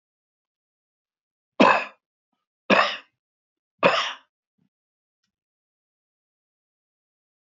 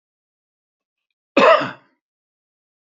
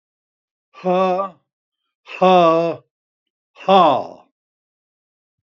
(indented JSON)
{
  "three_cough_length": "7.5 s",
  "three_cough_amplitude": 25451,
  "three_cough_signal_mean_std_ratio": 0.23,
  "cough_length": "2.8 s",
  "cough_amplitude": 29877,
  "cough_signal_mean_std_ratio": 0.25,
  "exhalation_length": "5.5 s",
  "exhalation_amplitude": 27859,
  "exhalation_signal_mean_std_ratio": 0.39,
  "survey_phase": "beta (2021-08-13 to 2022-03-07)",
  "age": "65+",
  "gender": "Male",
  "wearing_mask": "No",
  "symptom_none": true,
  "smoker_status": "Ex-smoker",
  "respiratory_condition_asthma": false,
  "respiratory_condition_other": true,
  "recruitment_source": "REACT",
  "submission_delay": "2 days",
  "covid_test_result": "Negative",
  "covid_test_method": "RT-qPCR",
  "influenza_a_test_result": "Negative",
  "influenza_b_test_result": "Negative"
}